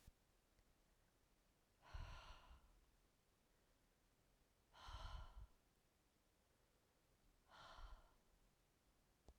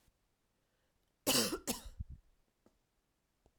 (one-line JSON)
{"exhalation_length": "9.4 s", "exhalation_amplitude": 236, "exhalation_signal_mean_std_ratio": 0.48, "cough_length": "3.6 s", "cough_amplitude": 4475, "cough_signal_mean_std_ratio": 0.29, "survey_phase": "alpha (2021-03-01 to 2021-08-12)", "age": "45-64", "gender": "Female", "wearing_mask": "No", "symptom_cough_any": true, "symptom_fatigue": true, "symptom_fever_high_temperature": true, "symptom_headache": true, "smoker_status": "Never smoked", "respiratory_condition_asthma": false, "respiratory_condition_other": false, "recruitment_source": "Test and Trace", "submission_delay": "1 day", "covid_test_result": "Positive", "covid_test_method": "RT-qPCR", "covid_ct_value": 14.7, "covid_ct_gene": "ORF1ab gene", "covid_ct_mean": 14.9, "covid_viral_load": "13000000 copies/ml", "covid_viral_load_category": "High viral load (>1M copies/ml)"}